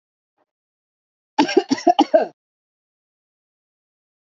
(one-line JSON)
{"cough_length": "4.3 s", "cough_amplitude": 27326, "cough_signal_mean_std_ratio": 0.25, "survey_phase": "beta (2021-08-13 to 2022-03-07)", "age": "18-44", "gender": "Female", "wearing_mask": "No", "symptom_none": true, "smoker_status": "Ex-smoker", "respiratory_condition_asthma": false, "respiratory_condition_other": false, "recruitment_source": "REACT", "submission_delay": "-14 days", "covid_test_result": "Negative", "covid_test_method": "RT-qPCR", "influenza_a_test_result": "Unknown/Void", "influenza_b_test_result": "Unknown/Void"}